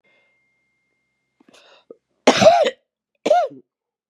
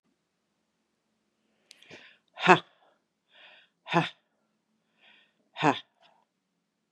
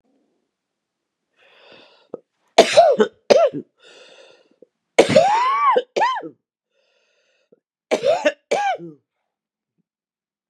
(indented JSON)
{
  "cough_length": "4.1 s",
  "cough_amplitude": 32182,
  "cough_signal_mean_std_ratio": 0.31,
  "exhalation_length": "6.9 s",
  "exhalation_amplitude": 29911,
  "exhalation_signal_mean_std_ratio": 0.17,
  "three_cough_length": "10.5 s",
  "three_cough_amplitude": 32768,
  "three_cough_signal_mean_std_ratio": 0.37,
  "survey_phase": "beta (2021-08-13 to 2022-03-07)",
  "age": "65+",
  "gender": "Female",
  "wearing_mask": "No",
  "symptom_cough_any": true,
  "symptom_runny_or_blocked_nose": true,
  "symptom_sore_throat": true,
  "symptom_fatigue": true,
  "symptom_onset": "6 days",
  "smoker_status": "Never smoked",
  "respiratory_condition_asthma": false,
  "respiratory_condition_other": false,
  "recruitment_source": "Test and Trace",
  "submission_delay": "2 days",
  "covid_test_result": "Positive",
  "covid_test_method": "RT-qPCR",
  "covid_ct_value": 32.5,
  "covid_ct_gene": "ORF1ab gene",
  "covid_ct_mean": 33.6,
  "covid_viral_load": "9.3 copies/ml",
  "covid_viral_load_category": "Minimal viral load (< 10K copies/ml)"
}